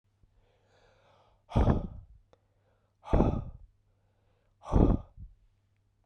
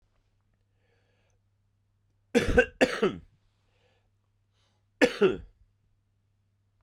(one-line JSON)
{"exhalation_length": "6.1 s", "exhalation_amplitude": 11930, "exhalation_signal_mean_std_ratio": 0.31, "three_cough_length": "6.8 s", "three_cough_amplitude": 14772, "three_cough_signal_mean_std_ratio": 0.26, "survey_phase": "beta (2021-08-13 to 2022-03-07)", "age": "18-44", "gender": "Male", "wearing_mask": "No", "symptom_cough_any": true, "symptom_runny_or_blocked_nose": true, "symptom_sore_throat": true, "symptom_fatigue": true, "symptom_headache": true, "smoker_status": "Never smoked", "respiratory_condition_asthma": false, "respiratory_condition_other": false, "recruitment_source": "Test and Trace", "submission_delay": "2 days", "covid_test_result": "Positive", "covid_test_method": "RT-qPCR"}